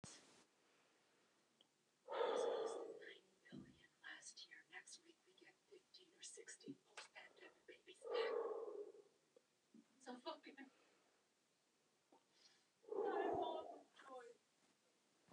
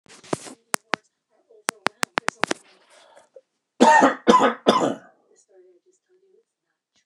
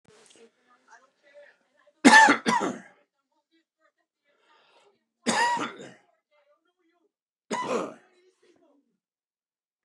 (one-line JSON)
{"exhalation_length": "15.3 s", "exhalation_amplitude": 894, "exhalation_signal_mean_std_ratio": 0.44, "cough_length": "7.1 s", "cough_amplitude": 29204, "cough_signal_mean_std_ratio": 0.29, "three_cough_length": "9.8 s", "three_cough_amplitude": 26043, "three_cough_signal_mean_std_ratio": 0.25, "survey_phase": "beta (2021-08-13 to 2022-03-07)", "age": "45-64", "gender": "Male", "wearing_mask": "No", "symptom_cough_any": true, "smoker_status": "Never smoked", "respiratory_condition_asthma": false, "respiratory_condition_other": false, "recruitment_source": "REACT", "submission_delay": "8 days", "covid_test_result": "Negative", "covid_test_method": "RT-qPCR", "influenza_a_test_result": "Negative", "influenza_b_test_result": "Negative"}